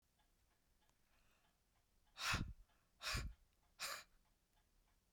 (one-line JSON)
{"exhalation_length": "5.1 s", "exhalation_amplitude": 1207, "exhalation_signal_mean_std_ratio": 0.35, "survey_phase": "beta (2021-08-13 to 2022-03-07)", "age": "45-64", "gender": "Female", "wearing_mask": "No", "symptom_none": true, "smoker_status": "Never smoked", "respiratory_condition_asthma": false, "respiratory_condition_other": false, "recruitment_source": "Test and Trace", "submission_delay": "2 days", "covid_test_result": "Negative", "covid_test_method": "RT-qPCR"}